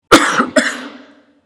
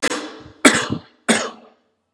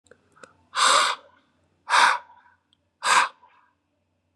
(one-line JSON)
{"cough_length": "1.5 s", "cough_amplitude": 32768, "cough_signal_mean_std_ratio": 0.48, "three_cough_length": "2.1 s", "three_cough_amplitude": 32768, "three_cough_signal_mean_std_ratio": 0.41, "exhalation_length": "4.4 s", "exhalation_amplitude": 22408, "exhalation_signal_mean_std_ratio": 0.38, "survey_phase": "beta (2021-08-13 to 2022-03-07)", "age": "18-44", "gender": "Male", "wearing_mask": "No", "symptom_cough_any": true, "symptom_fatigue": true, "symptom_headache": true, "symptom_other": true, "symptom_onset": "3 days", "smoker_status": "Never smoked", "respiratory_condition_asthma": false, "respiratory_condition_other": false, "recruitment_source": "Test and Trace", "submission_delay": "2 days", "covid_test_result": "Positive", "covid_test_method": "RT-qPCR", "covid_ct_value": 22.3, "covid_ct_gene": "ORF1ab gene", "covid_ct_mean": 22.8, "covid_viral_load": "33000 copies/ml", "covid_viral_load_category": "Low viral load (10K-1M copies/ml)"}